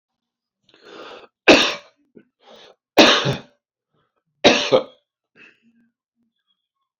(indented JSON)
{
  "three_cough_length": "7.0 s",
  "three_cough_amplitude": 30487,
  "three_cough_signal_mean_std_ratio": 0.28,
  "survey_phase": "beta (2021-08-13 to 2022-03-07)",
  "age": "65+",
  "gender": "Male",
  "wearing_mask": "No",
  "symptom_none": true,
  "symptom_onset": "5 days",
  "smoker_status": "Ex-smoker",
  "respiratory_condition_asthma": true,
  "respiratory_condition_other": false,
  "recruitment_source": "REACT",
  "submission_delay": "2 days",
  "covid_test_result": "Negative",
  "covid_test_method": "RT-qPCR"
}